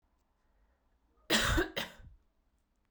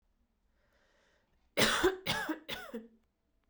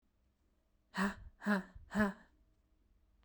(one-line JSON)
{"cough_length": "2.9 s", "cough_amplitude": 5837, "cough_signal_mean_std_ratio": 0.34, "three_cough_length": "3.5 s", "three_cough_amplitude": 6984, "three_cough_signal_mean_std_ratio": 0.38, "exhalation_length": "3.2 s", "exhalation_amplitude": 2730, "exhalation_signal_mean_std_ratio": 0.36, "survey_phase": "beta (2021-08-13 to 2022-03-07)", "age": "18-44", "gender": "Female", "wearing_mask": "No", "symptom_cough_any": true, "symptom_runny_or_blocked_nose": true, "symptom_sore_throat": true, "symptom_diarrhoea": true, "symptom_fatigue": true, "symptom_headache": true, "symptom_change_to_sense_of_smell_or_taste": true, "symptom_onset": "3 days", "smoker_status": "Ex-smoker", "respiratory_condition_asthma": false, "respiratory_condition_other": false, "recruitment_source": "Test and Trace", "submission_delay": "1 day", "covid_test_result": "Positive", "covid_test_method": "RT-qPCR", "covid_ct_value": 23.7, "covid_ct_gene": "N gene"}